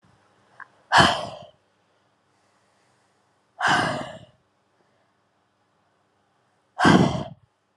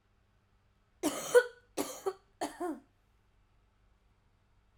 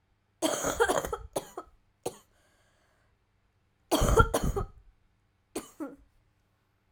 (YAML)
exhalation_length: 7.8 s
exhalation_amplitude: 29418
exhalation_signal_mean_std_ratio: 0.3
three_cough_length: 4.8 s
three_cough_amplitude: 8176
three_cough_signal_mean_std_ratio: 0.26
cough_length: 6.9 s
cough_amplitude: 17464
cough_signal_mean_std_ratio: 0.36
survey_phase: alpha (2021-03-01 to 2021-08-12)
age: 18-44
gender: Female
wearing_mask: 'No'
symptom_cough_any: true
symptom_new_continuous_cough: true
symptom_fatigue: true
symptom_fever_high_temperature: true
symptom_headache: true
symptom_onset: 3 days
smoker_status: Never smoked
respiratory_condition_asthma: false
respiratory_condition_other: false
recruitment_source: Test and Trace
submission_delay: 1 day
covid_test_result: Positive
covid_test_method: RT-qPCR
covid_ct_value: 26.8
covid_ct_gene: ORF1ab gene